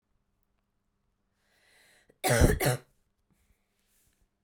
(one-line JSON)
{"cough_length": "4.4 s", "cough_amplitude": 11621, "cough_signal_mean_std_ratio": 0.26, "survey_phase": "beta (2021-08-13 to 2022-03-07)", "age": "18-44", "gender": "Female", "wearing_mask": "No", "symptom_cough_any": true, "symptom_new_continuous_cough": true, "symptom_runny_or_blocked_nose": true, "symptom_shortness_of_breath": true, "symptom_sore_throat": true, "symptom_fatigue": true, "symptom_headache": true, "symptom_change_to_sense_of_smell_or_taste": true, "symptom_onset": "3 days", "smoker_status": "Never smoked", "respiratory_condition_asthma": false, "respiratory_condition_other": false, "recruitment_source": "Test and Trace", "submission_delay": "2 days", "covid_test_result": "Positive", "covid_test_method": "RT-qPCR"}